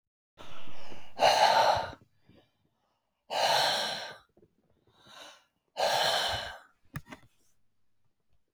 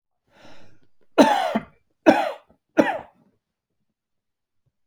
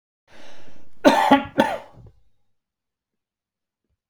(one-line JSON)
{"exhalation_length": "8.5 s", "exhalation_amplitude": 11402, "exhalation_signal_mean_std_ratio": 0.52, "three_cough_length": "4.9 s", "three_cough_amplitude": 28401, "three_cough_signal_mean_std_ratio": 0.3, "cough_length": "4.1 s", "cough_amplitude": 30422, "cough_signal_mean_std_ratio": 0.37, "survey_phase": "beta (2021-08-13 to 2022-03-07)", "age": "65+", "gender": "Male", "wearing_mask": "No", "symptom_none": true, "smoker_status": "Ex-smoker", "respiratory_condition_asthma": false, "respiratory_condition_other": false, "recruitment_source": "REACT", "submission_delay": "2 days", "covid_test_result": "Negative", "covid_test_method": "RT-qPCR"}